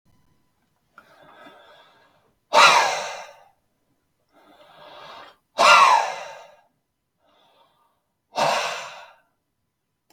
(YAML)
exhalation_length: 10.1 s
exhalation_amplitude: 32766
exhalation_signal_mean_std_ratio: 0.3
survey_phase: beta (2021-08-13 to 2022-03-07)
age: 18-44
gender: Male
wearing_mask: 'No'
symptom_none: true
smoker_status: Ex-smoker
respiratory_condition_asthma: true
respiratory_condition_other: false
recruitment_source: Test and Trace
submission_delay: 1 day
covid_test_result: Negative
covid_test_method: RT-qPCR